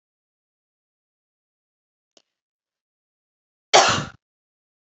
{"cough_length": "4.9 s", "cough_amplitude": 32767, "cough_signal_mean_std_ratio": 0.18, "survey_phase": "beta (2021-08-13 to 2022-03-07)", "age": "18-44", "gender": "Female", "wearing_mask": "No", "symptom_cough_any": true, "symptom_runny_or_blocked_nose": true, "symptom_fatigue": true, "symptom_onset": "2 days", "smoker_status": "Ex-smoker", "respiratory_condition_asthma": false, "respiratory_condition_other": false, "recruitment_source": "Test and Trace", "submission_delay": "2 days", "covid_test_result": "Positive", "covid_test_method": "RT-qPCR", "covid_ct_value": 17.9, "covid_ct_gene": "N gene", "covid_ct_mean": 18.8, "covid_viral_load": "690000 copies/ml", "covid_viral_load_category": "Low viral load (10K-1M copies/ml)"}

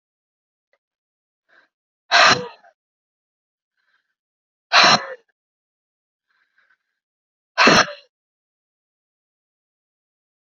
{"exhalation_length": "10.4 s", "exhalation_amplitude": 31916, "exhalation_signal_mean_std_ratio": 0.23, "survey_phase": "beta (2021-08-13 to 2022-03-07)", "age": "18-44", "gender": "Female", "wearing_mask": "No", "symptom_cough_any": true, "symptom_runny_or_blocked_nose": true, "symptom_headache": true, "smoker_status": "Never smoked", "respiratory_condition_asthma": false, "respiratory_condition_other": false, "recruitment_source": "Test and Trace", "submission_delay": "2 days", "covid_test_result": "Positive", "covid_test_method": "ePCR"}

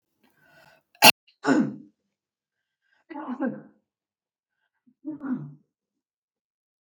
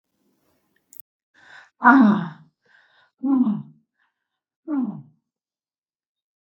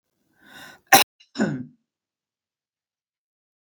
{"three_cough_length": "6.8 s", "three_cough_amplitude": 32766, "three_cough_signal_mean_std_ratio": 0.22, "exhalation_length": "6.6 s", "exhalation_amplitude": 32766, "exhalation_signal_mean_std_ratio": 0.31, "cough_length": "3.7 s", "cough_amplitude": 32768, "cough_signal_mean_std_ratio": 0.2, "survey_phase": "beta (2021-08-13 to 2022-03-07)", "age": "65+", "gender": "Female", "wearing_mask": "No", "symptom_none": true, "smoker_status": "Never smoked", "respiratory_condition_asthma": false, "respiratory_condition_other": false, "recruitment_source": "REACT", "submission_delay": "1 day", "covid_test_result": "Negative", "covid_test_method": "RT-qPCR", "influenza_a_test_result": "Negative", "influenza_b_test_result": "Negative"}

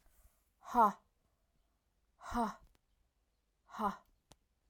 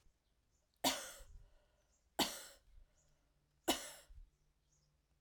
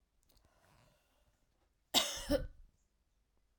{"exhalation_length": "4.7 s", "exhalation_amplitude": 4412, "exhalation_signal_mean_std_ratio": 0.27, "three_cough_length": "5.2 s", "three_cough_amplitude": 3234, "three_cough_signal_mean_std_ratio": 0.28, "cough_length": "3.6 s", "cough_amplitude": 5859, "cough_signal_mean_std_ratio": 0.27, "survey_phase": "alpha (2021-03-01 to 2021-08-12)", "age": "45-64", "gender": "Female", "wearing_mask": "No", "symptom_fatigue": true, "symptom_headache": true, "smoker_status": "Never smoked", "respiratory_condition_asthma": false, "respiratory_condition_other": false, "recruitment_source": "Test and Trace", "submission_delay": "2 days", "covid_test_result": "Positive", "covid_test_method": "RT-qPCR"}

